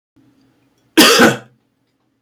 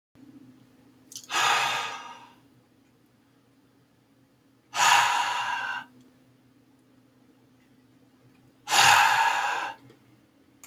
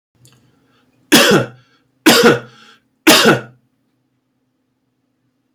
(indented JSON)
{
  "cough_length": "2.2 s",
  "cough_amplitude": 32768,
  "cough_signal_mean_std_ratio": 0.35,
  "exhalation_length": "10.7 s",
  "exhalation_amplitude": 19400,
  "exhalation_signal_mean_std_ratio": 0.4,
  "three_cough_length": "5.5 s",
  "three_cough_amplitude": 32768,
  "three_cough_signal_mean_std_ratio": 0.36,
  "survey_phase": "beta (2021-08-13 to 2022-03-07)",
  "age": "45-64",
  "gender": "Male",
  "wearing_mask": "No",
  "symptom_none": true,
  "symptom_onset": "12 days",
  "smoker_status": "Never smoked",
  "respiratory_condition_asthma": false,
  "respiratory_condition_other": false,
  "recruitment_source": "REACT",
  "submission_delay": "2 days",
  "covid_test_result": "Negative",
  "covid_test_method": "RT-qPCR"
}